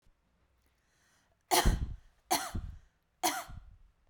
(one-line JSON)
{"three_cough_length": "4.1 s", "three_cough_amplitude": 7848, "three_cough_signal_mean_std_ratio": 0.36, "survey_phase": "beta (2021-08-13 to 2022-03-07)", "age": "18-44", "gender": "Female", "wearing_mask": "No", "symptom_runny_or_blocked_nose": true, "smoker_status": "Never smoked", "respiratory_condition_asthma": false, "respiratory_condition_other": false, "recruitment_source": "REACT", "submission_delay": "2 days", "covid_test_result": "Negative", "covid_test_method": "RT-qPCR", "influenza_a_test_result": "Unknown/Void", "influenza_b_test_result": "Unknown/Void"}